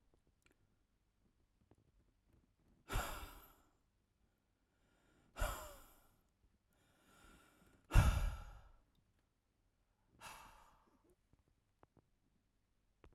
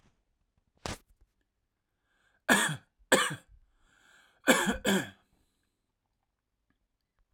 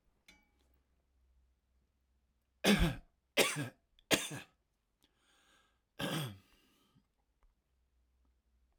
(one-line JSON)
{"exhalation_length": "13.1 s", "exhalation_amplitude": 5005, "exhalation_signal_mean_std_ratio": 0.21, "cough_length": "7.3 s", "cough_amplitude": 14077, "cough_signal_mean_std_ratio": 0.28, "three_cough_length": "8.8 s", "three_cough_amplitude": 6578, "three_cough_signal_mean_std_ratio": 0.26, "survey_phase": "alpha (2021-03-01 to 2021-08-12)", "age": "18-44", "gender": "Male", "wearing_mask": "No", "symptom_none": true, "smoker_status": "Current smoker (1 to 10 cigarettes per day)", "respiratory_condition_asthma": false, "respiratory_condition_other": false, "recruitment_source": "REACT", "submission_delay": "1 day", "covid_test_result": "Negative", "covid_test_method": "RT-qPCR"}